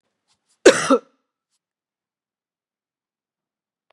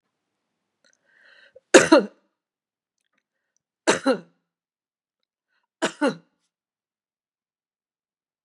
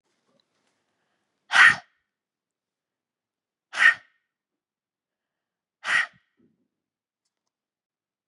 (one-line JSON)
{"cough_length": "3.9 s", "cough_amplitude": 32768, "cough_signal_mean_std_ratio": 0.18, "three_cough_length": "8.4 s", "three_cough_amplitude": 32767, "three_cough_signal_mean_std_ratio": 0.19, "exhalation_length": "8.3 s", "exhalation_amplitude": 26621, "exhalation_signal_mean_std_ratio": 0.19, "survey_phase": "beta (2021-08-13 to 2022-03-07)", "age": "45-64", "gender": "Female", "wearing_mask": "No", "symptom_none": true, "smoker_status": "Never smoked", "respiratory_condition_asthma": false, "respiratory_condition_other": false, "recruitment_source": "REACT", "submission_delay": "3 days", "covid_test_result": "Negative", "covid_test_method": "RT-qPCR", "influenza_a_test_result": "Negative", "influenza_b_test_result": "Negative"}